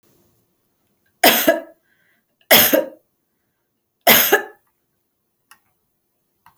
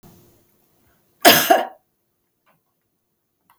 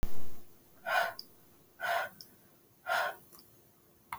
{
  "three_cough_length": "6.6 s",
  "three_cough_amplitude": 32767,
  "three_cough_signal_mean_std_ratio": 0.3,
  "cough_length": "3.6 s",
  "cough_amplitude": 32767,
  "cough_signal_mean_std_ratio": 0.24,
  "exhalation_length": "4.2 s",
  "exhalation_amplitude": 4911,
  "exhalation_signal_mean_std_ratio": 0.46,
  "survey_phase": "beta (2021-08-13 to 2022-03-07)",
  "age": "45-64",
  "gender": "Female",
  "wearing_mask": "No",
  "symptom_none": true,
  "smoker_status": "Never smoked",
  "respiratory_condition_asthma": false,
  "respiratory_condition_other": false,
  "recruitment_source": "REACT",
  "submission_delay": "2 days",
  "covid_test_result": "Negative",
  "covid_test_method": "RT-qPCR"
}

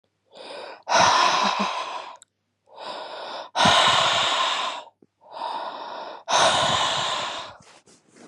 {
  "exhalation_length": "8.3 s",
  "exhalation_amplitude": 18939,
  "exhalation_signal_mean_std_ratio": 0.63,
  "survey_phase": "beta (2021-08-13 to 2022-03-07)",
  "age": "18-44",
  "gender": "Female",
  "wearing_mask": "No",
  "symptom_cough_any": true,
  "symptom_runny_or_blocked_nose": true,
  "symptom_shortness_of_breath": true,
  "symptom_sore_throat": true,
  "symptom_fatigue": true,
  "symptom_fever_high_temperature": true,
  "symptom_headache": true,
  "smoker_status": "Never smoked",
  "respiratory_condition_asthma": true,
  "respiratory_condition_other": false,
  "recruitment_source": "Test and Trace",
  "submission_delay": "2 days",
  "covid_test_result": "Positive",
  "covid_test_method": "LFT"
}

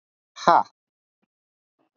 {
  "exhalation_length": "2.0 s",
  "exhalation_amplitude": 27632,
  "exhalation_signal_mean_std_ratio": 0.2,
  "survey_phase": "beta (2021-08-13 to 2022-03-07)",
  "age": "18-44",
  "gender": "Male",
  "wearing_mask": "No",
  "symptom_cough_any": true,
  "symptom_new_continuous_cough": true,
  "symptom_runny_or_blocked_nose": true,
  "symptom_shortness_of_breath": true,
  "symptom_sore_throat": true,
  "symptom_other": true,
  "smoker_status": "Never smoked",
  "respiratory_condition_asthma": true,
  "respiratory_condition_other": false,
  "recruitment_source": "Test and Trace",
  "submission_delay": "2 days",
  "covid_test_result": "Positive",
  "covid_test_method": "LFT"
}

